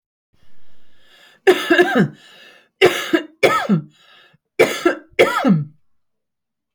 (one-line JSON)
{"three_cough_length": "6.7 s", "three_cough_amplitude": 31874, "three_cough_signal_mean_std_ratio": 0.45, "survey_phase": "beta (2021-08-13 to 2022-03-07)", "age": "65+", "gender": "Female", "wearing_mask": "No", "symptom_none": true, "smoker_status": "Never smoked", "respiratory_condition_asthma": false, "respiratory_condition_other": false, "recruitment_source": "REACT", "submission_delay": "3 days", "covid_test_result": "Negative", "covid_test_method": "RT-qPCR"}